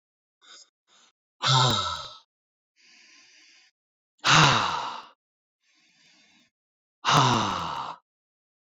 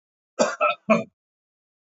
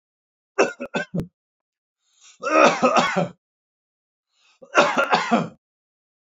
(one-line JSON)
{"exhalation_length": "8.8 s", "exhalation_amplitude": 18469, "exhalation_signal_mean_std_ratio": 0.37, "cough_length": "2.0 s", "cough_amplitude": 18711, "cough_signal_mean_std_ratio": 0.35, "three_cough_length": "6.4 s", "three_cough_amplitude": 27219, "three_cough_signal_mean_std_ratio": 0.4, "survey_phase": "beta (2021-08-13 to 2022-03-07)", "age": "45-64", "gender": "Male", "wearing_mask": "No", "symptom_none": true, "smoker_status": "Never smoked", "respiratory_condition_asthma": false, "respiratory_condition_other": false, "recruitment_source": "REACT", "submission_delay": "3 days", "covid_test_result": "Negative", "covid_test_method": "RT-qPCR"}